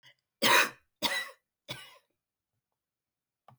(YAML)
three_cough_length: 3.6 s
three_cough_amplitude: 9823
three_cough_signal_mean_std_ratio: 0.29
survey_phase: beta (2021-08-13 to 2022-03-07)
age: 45-64
gender: Female
wearing_mask: 'No'
symptom_none: true
smoker_status: Ex-smoker
respiratory_condition_asthma: false
respiratory_condition_other: false
recruitment_source: REACT
submission_delay: 1 day
covid_test_result: Negative
covid_test_method: RT-qPCR
influenza_a_test_result: Negative
influenza_b_test_result: Negative